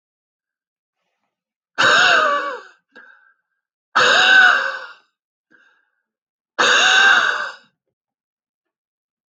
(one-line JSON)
{"exhalation_length": "9.3 s", "exhalation_amplitude": 27471, "exhalation_signal_mean_std_ratio": 0.43, "survey_phase": "alpha (2021-03-01 to 2021-08-12)", "age": "65+", "gender": "Male", "wearing_mask": "No", "symptom_fatigue": true, "symptom_onset": "5 days", "smoker_status": "Never smoked", "respiratory_condition_asthma": false, "respiratory_condition_other": false, "recruitment_source": "REACT", "submission_delay": "1 day", "covid_test_result": "Negative", "covid_test_method": "RT-qPCR"}